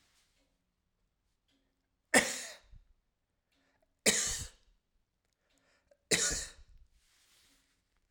{"three_cough_length": "8.1 s", "three_cough_amplitude": 13175, "three_cough_signal_mean_std_ratio": 0.25, "survey_phase": "alpha (2021-03-01 to 2021-08-12)", "age": "45-64", "gender": "Male", "wearing_mask": "No", "symptom_none": true, "smoker_status": "Ex-smoker", "respiratory_condition_asthma": false, "respiratory_condition_other": false, "recruitment_source": "REACT", "submission_delay": "1 day", "covid_test_result": "Negative", "covid_test_method": "RT-qPCR"}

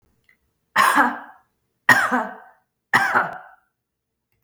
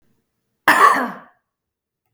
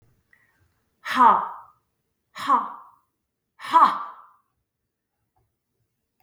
{"three_cough_length": "4.4 s", "three_cough_amplitude": 32766, "three_cough_signal_mean_std_ratio": 0.4, "cough_length": "2.1 s", "cough_amplitude": 32768, "cough_signal_mean_std_ratio": 0.34, "exhalation_length": "6.2 s", "exhalation_amplitude": 25198, "exhalation_signal_mean_std_ratio": 0.29, "survey_phase": "beta (2021-08-13 to 2022-03-07)", "age": "45-64", "gender": "Female", "wearing_mask": "No", "symptom_none": true, "smoker_status": "Never smoked", "respiratory_condition_asthma": false, "respiratory_condition_other": false, "recruitment_source": "REACT", "submission_delay": "2 days", "covid_test_result": "Negative", "covid_test_method": "RT-qPCR", "influenza_a_test_result": "Negative", "influenza_b_test_result": "Negative"}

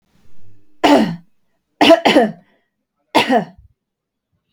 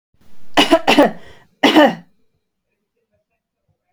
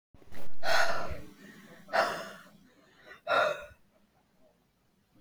{"three_cough_length": "4.5 s", "three_cough_amplitude": 32768, "three_cough_signal_mean_std_ratio": 0.4, "cough_length": "3.9 s", "cough_amplitude": 32768, "cough_signal_mean_std_ratio": 0.39, "exhalation_length": "5.2 s", "exhalation_amplitude": 8346, "exhalation_signal_mean_std_ratio": 0.52, "survey_phase": "beta (2021-08-13 to 2022-03-07)", "age": "18-44", "gender": "Female", "wearing_mask": "No", "symptom_none": true, "smoker_status": "Never smoked", "respiratory_condition_asthma": false, "respiratory_condition_other": false, "recruitment_source": "REACT", "submission_delay": "1 day", "covid_test_result": "Negative", "covid_test_method": "RT-qPCR", "influenza_a_test_result": "Negative", "influenza_b_test_result": "Negative"}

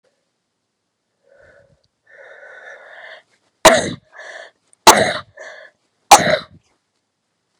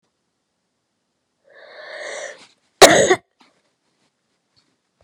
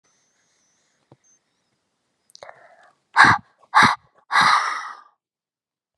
{"three_cough_length": "7.6 s", "three_cough_amplitude": 32768, "three_cough_signal_mean_std_ratio": 0.24, "cough_length": "5.0 s", "cough_amplitude": 32768, "cough_signal_mean_std_ratio": 0.21, "exhalation_length": "6.0 s", "exhalation_amplitude": 32767, "exhalation_signal_mean_std_ratio": 0.3, "survey_phase": "beta (2021-08-13 to 2022-03-07)", "age": "45-64", "gender": "Female", "wearing_mask": "No", "symptom_cough_any": true, "symptom_runny_or_blocked_nose": true, "symptom_sore_throat": true, "symptom_change_to_sense_of_smell_or_taste": true, "symptom_onset": "5 days", "smoker_status": "Never smoked", "respiratory_condition_asthma": false, "respiratory_condition_other": false, "recruitment_source": "Test and Trace", "submission_delay": "1 day", "covid_test_result": "Positive", "covid_test_method": "RT-qPCR", "covid_ct_value": 12.3, "covid_ct_gene": "N gene", "covid_ct_mean": 12.4, "covid_viral_load": "84000000 copies/ml", "covid_viral_load_category": "High viral load (>1M copies/ml)"}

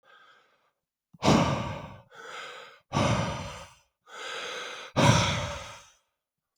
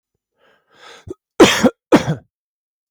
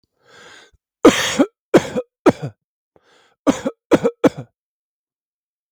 {"exhalation_length": "6.6 s", "exhalation_amplitude": 15136, "exhalation_signal_mean_std_ratio": 0.46, "cough_length": "2.9 s", "cough_amplitude": 32768, "cough_signal_mean_std_ratio": 0.3, "three_cough_length": "5.7 s", "three_cough_amplitude": 32768, "three_cough_signal_mean_std_ratio": 0.3, "survey_phase": "beta (2021-08-13 to 2022-03-07)", "age": "45-64", "gender": "Male", "wearing_mask": "No", "symptom_none": true, "smoker_status": "Never smoked", "respiratory_condition_asthma": false, "respiratory_condition_other": false, "recruitment_source": "REACT", "submission_delay": "2 days", "covid_test_result": "Negative", "covid_test_method": "RT-qPCR"}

